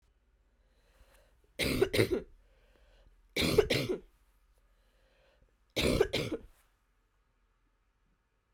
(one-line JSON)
{"three_cough_length": "8.5 s", "three_cough_amplitude": 10148, "three_cough_signal_mean_std_ratio": 0.34, "survey_phase": "alpha (2021-03-01 to 2021-08-12)", "age": "45-64", "gender": "Female", "wearing_mask": "No", "symptom_cough_any": true, "symptom_fatigue": true, "symptom_headache": true, "smoker_status": "Never smoked", "respiratory_condition_asthma": false, "respiratory_condition_other": false, "recruitment_source": "Test and Trace", "submission_delay": "2 days", "covid_test_result": "Positive", "covid_test_method": "RT-qPCR"}